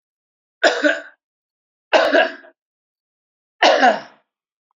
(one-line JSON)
{"three_cough_length": "4.8 s", "three_cough_amplitude": 29524, "three_cough_signal_mean_std_ratio": 0.37, "survey_phase": "beta (2021-08-13 to 2022-03-07)", "age": "65+", "gender": "Male", "wearing_mask": "No", "symptom_none": true, "smoker_status": "Ex-smoker", "respiratory_condition_asthma": false, "respiratory_condition_other": false, "recruitment_source": "REACT", "submission_delay": "2 days", "covid_test_result": "Negative", "covid_test_method": "RT-qPCR"}